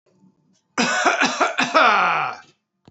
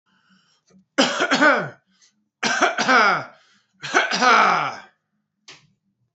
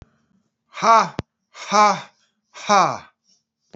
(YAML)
cough_length: 2.9 s
cough_amplitude: 28506
cough_signal_mean_std_ratio: 0.59
three_cough_length: 6.1 s
three_cough_amplitude: 28026
three_cough_signal_mean_std_ratio: 0.47
exhalation_length: 3.8 s
exhalation_amplitude: 28411
exhalation_signal_mean_std_ratio: 0.37
survey_phase: beta (2021-08-13 to 2022-03-07)
age: 45-64
gender: Male
wearing_mask: 'Yes'
symptom_sore_throat: true
symptom_onset: 4 days
smoker_status: Ex-smoker
respiratory_condition_asthma: false
respiratory_condition_other: false
recruitment_source: Test and Trace
submission_delay: 2 days
covid_test_result: Positive
covid_test_method: RT-qPCR
covid_ct_value: 29.8
covid_ct_gene: ORF1ab gene